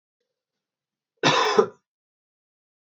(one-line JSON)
{"cough_length": "2.8 s", "cough_amplitude": 25943, "cough_signal_mean_std_ratio": 0.29, "survey_phase": "beta (2021-08-13 to 2022-03-07)", "age": "18-44", "gender": "Male", "wearing_mask": "No", "symptom_cough_any": true, "symptom_runny_or_blocked_nose": true, "symptom_sore_throat": true, "symptom_abdominal_pain": true, "symptom_fatigue": true, "symptom_headache": true, "smoker_status": "Never smoked", "respiratory_condition_asthma": true, "respiratory_condition_other": false, "recruitment_source": "Test and Trace", "submission_delay": "2 days", "covid_test_result": "Positive", "covid_test_method": "LFT"}